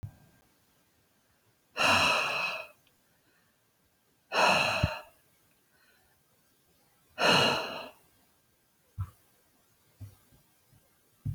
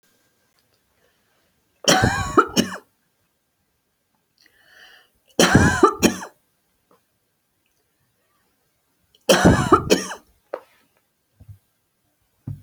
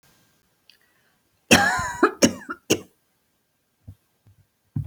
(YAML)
exhalation_length: 11.3 s
exhalation_amplitude: 9191
exhalation_signal_mean_std_ratio: 0.36
three_cough_length: 12.6 s
three_cough_amplitude: 30703
three_cough_signal_mean_std_ratio: 0.3
cough_length: 4.9 s
cough_amplitude: 32139
cough_signal_mean_std_ratio: 0.29
survey_phase: alpha (2021-03-01 to 2021-08-12)
age: 65+
gender: Female
wearing_mask: 'No'
symptom_none: true
smoker_status: Ex-smoker
respiratory_condition_asthma: false
respiratory_condition_other: false
recruitment_source: REACT
submission_delay: 2 days
covid_test_result: Negative
covid_test_method: RT-qPCR